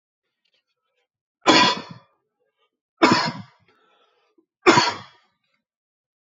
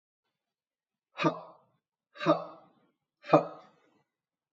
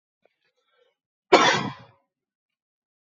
{"three_cough_length": "6.2 s", "three_cough_amplitude": 31678, "three_cough_signal_mean_std_ratio": 0.29, "exhalation_length": "4.5 s", "exhalation_amplitude": 16362, "exhalation_signal_mean_std_ratio": 0.24, "cough_length": "3.2 s", "cough_amplitude": 27170, "cough_signal_mean_std_ratio": 0.24, "survey_phase": "beta (2021-08-13 to 2022-03-07)", "age": "45-64", "gender": "Male", "wearing_mask": "No", "symptom_cough_any": true, "symptom_runny_or_blocked_nose": true, "symptom_fever_high_temperature": true, "symptom_headache": true, "symptom_onset": "4 days", "smoker_status": "Never smoked", "respiratory_condition_asthma": false, "respiratory_condition_other": false, "recruitment_source": "Test and Trace", "submission_delay": "1 day", "covid_test_result": "Positive", "covid_test_method": "RT-qPCR", "covid_ct_value": 17.4, "covid_ct_gene": "ORF1ab gene", "covid_ct_mean": 18.3, "covid_viral_load": "1000000 copies/ml", "covid_viral_load_category": "Low viral load (10K-1M copies/ml)"}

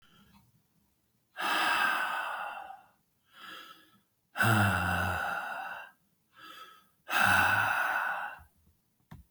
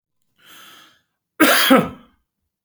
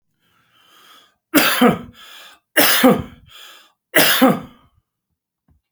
{"exhalation_length": "9.3 s", "exhalation_amplitude": 8038, "exhalation_signal_mean_std_ratio": 0.55, "cough_length": "2.6 s", "cough_amplitude": 30524, "cough_signal_mean_std_ratio": 0.35, "three_cough_length": "5.7 s", "three_cough_amplitude": 32768, "three_cough_signal_mean_std_ratio": 0.4, "survey_phase": "beta (2021-08-13 to 2022-03-07)", "age": "65+", "gender": "Male", "wearing_mask": "No", "symptom_none": true, "smoker_status": "Ex-smoker", "respiratory_condition_asthma": false, "respiratory_condition_other": false, "recruitment_source": "REACT", "submission_delay": "3 days", "covid_test_result": "Negative", "covid_test_method": "RT-qPCR"}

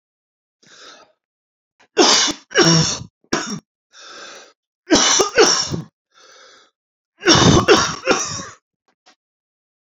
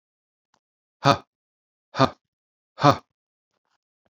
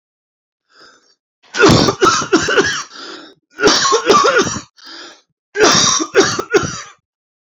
{"three_cough_length": "9.9 s", "three_cough_amplitude": 32768, "three_cough_signal_mean_std_ratio": 0.42, "exhalation_length": "4.1 s", "exhalation_amplitude": 28611, "exhalation_signal_mean_std_ratio": 0.2, "cough_length": "7.4 s", "cough_amplitude": 32768, "cough_signal_mean_std_ratio": 0.55, "survey_phase": "beta (2021-08-13 to 2022-03-07)", "age": "18-44", "gender": "Male", "wearing_mask": "No", "symptom_cough_any": true, "symptom_sore_throat": true, "symptom_fatigue": true, "symptom_headache": true, "symptom_other": true, "smoker_status": "Ex-smoker", "respiratory_condition_asthma": false, "respiratory_condition_other": false, "recruitment_source": "REACT", "submission_delay": "6 days", "covid_test_result": "Negative", "covid_test_method": "RT-qPCR"}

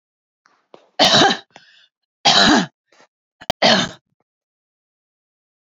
{"three_cough_length": "5.6 s", "three_cough_amplitude": 31843, "three_cough_signal_mean_std_ratio": 0.35, "survey_phase": "beta (2021-08-13 to 2022-03-07)", "age": "45-64", "gender": "Female", "wearing_mask": "No", "symptom_none": true, "smoker_status": "Never smoked", "respiratory_condition_asthma": false, "respiratory_condition_other": false, "recruitment_source": "Test and Trace", "submission_delay": "1 day", "covid_test_result": "Negative", "covid_test_method": "RT-qPCR"}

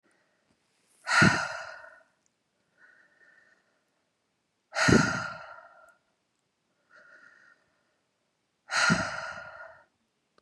{"exhalation_length": "10.4 s", "exhalation_amplitude": 16738, "exhalation_signal_mean_std_ratio": 0.3, "survey_phase": "beta (2021-08-13 to 2022-03-07)", "age": "45-64", "gender": "Female", "wearing_mask": "No", "symptom_cough_any": true, "symptom_fatigue": true, "symptom_headache": true, "symptom_loss_of_taste": true, "smoker_status": "Ex-smoker", "respiratory_condition_asthma": false, "respiratory_condition_other": false, "recruitment_source": "Test and Trace", "submission_delay": "2 days", "covid_test_result": "Positive", "covid_test_method": "ePCR"}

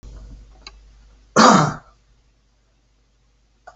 {"cough_length": "3.8 s", "cough_amplitude": 28478, "cough_signal_mean_std_ratio": 0.27, "survey_phase": "alpha (2021-03-01 to 2021-08-12)", "age": "65+", "gender": "Male", "wearing_mask": "No", "symptom_none": true, "smoker_status": "Never smoked", "respiratory_condition_asthma": false, "respiratory_condition_other": false, "recruitment_source": "REACT", "submission_delay": "1 day", "covid_test_result": "Negative", "covid_test_method": "RT-qPCR"}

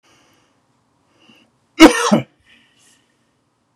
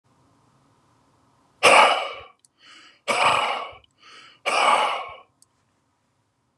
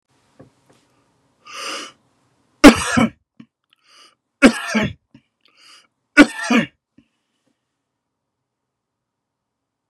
{"cough_length": "3.8 s", "cough_amplitude": 32768, "cough_signal_mean_std_ratio": 0.22, "exhalation_length": "6.6 s", "exhalation_amplitude": 27771, "exhalation_signal_mean_std_ratio": 0.38, "three_cough_length": "9.9 s", "three_cough_amplitude": 32768, "three_cough_signal_mean_std_ratio": 0.23, "survey_phase": "beta (2021-08-13 to 2022-03-07)", "age": "65+", "gender": "Male", "wearing_mask": "No", "symptom_sore_throat": true, "smoker_status": "Never smoked", "respiratory_condition_asthma": true, "respiratory_condition_other": false, "recruitment_source": "REACT", "submission_delay": "1 day", "covid_test_result": "Negative", "covid_test_method": "RT-qPCR"}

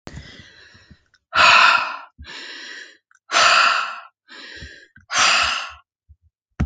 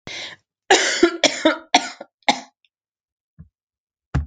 {"exhalation_length": "6.7 s", "exhalation_amplitude": 29324, "exhalation_signal_mean_std_ratio": 0.45, "cough_length": "4.3 s", "cough_amplitude": 29607, "cough_signal_mean_std_ratio": 0.36, "survey_phase": "alpha (2021-03-01 to 2021-08-12)", "age": "18-44", "gender": "Female", "wearing_mask": "No", "symptom_none": true, "smoker_status": "Ex-smoker", "respiratory_condition_asthma": false, "respiratory_condition_other": false, "recruitment_source": "REACT", "submission_delay": "2 days", "covid_test_result": "Negative", "covid_test_method": "RT-qPCR"}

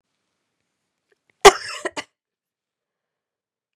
{"cough_length": "3.8 s", "cough_amplitude": 32768, "cough_signal_mean_std_ratio": 0.14, "survey_phase": "beta (2021-08-13 to 2022-03-07)", "age": "18-44", "gender": "Female", "wearing_mask": "No", "symptom_runny_or_blocked_nose": true, "symptom_onset": "15 days", "smoker_status": "Never smoked", "respiratory_condition_asthma": false, "respiratory_condition_other": false, "recruitment_source": "Test and Trace", "submission_delay": "14 days", "covid_test_result": "Negative", "covid_test_method": "ePCR"}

